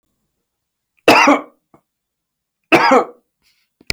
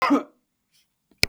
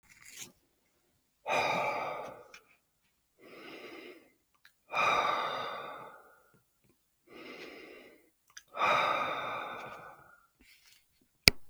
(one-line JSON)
{"three_cough_length": "3.9 s", "three_cough_amplitude": 32768, "three_cough_signal_mean_std_ratio": 0.33, "cough_length": "1.3 s", "cough_amplitude": 32767, "cough_signal_mean_std_ratio": 0.32, "exhalation_length": "11.7 s", "exhalation_amplitude": 32768, "exhalation_signal_mean_std_ratio": 0.4, "survey_phase": "beta (2021-08-13 to 2022-03-07)", "age": "65+", "gender": "Male", "wearing_mask": "No", "symptom_none": true, "symptom_onset": "8 days", "smoker_status": "Ex-smoker", "respiratory_condition_asthma": false, "respiratory_condition_other": false, "recruitment_source": "REACT", "submission_delay": "2 days", "covid_test_result": "Negative", "covid_test_method": "RT-qPCR", "influenza_a_test_result": "Negative", "influenza_b_test_result": "Negative"}